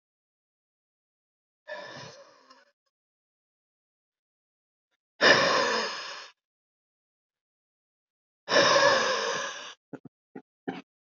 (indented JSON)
{
  "exhalation_length": "11.0 s",
  "exhalation_amplitude": 18932,
  "exhalation_signal_mean_std_ratio": 0.33,
  "survey_phase": "beta (2021-08-13 to 2022-03-07)",
  "age": "18-44",
  "gender": "Male",
  "wearing_mask": "No",
  "symptom_cough_any": true,
  "symptom_runny_or_blocked_nose": true,
  "symptom_onset": "9 days",
  "smoker_status": "Never smoked",
  "respiratory_condition_asthma": false,
  "respiratory_condition_other": false,
  "recruitment_source": "REACT",
  "submission_delay": "4 days",
  "covid_test_result": "Negative",
  "covid_test_method": "RT-qPCR",
  "influenza_a_test_result": "Negative",
  "influenza_b_test_result": "Negative"
}